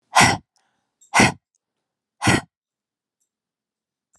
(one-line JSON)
{"exhalation_length": "4.2 s", "exhalation_amplitude": 31086, "exhalation_signal_mean_std_ratio": 0.28, "survey_phase": "alpha (2021-03-01 to 2021-08-12)", "age": "18-44", "gender": "Female", "wearing_mask": "No", "symptom_none": true, "symptom_onset": "3 days", "smoker_status": "Never smoked", "respiratory_condition_asthma": false, "respiratory_condition_other": false, "recruitment_source": "REACT", "submission_delay": "2 days", "covid_test_result": "Negative", "covid_test_method": "RT-qPCR"}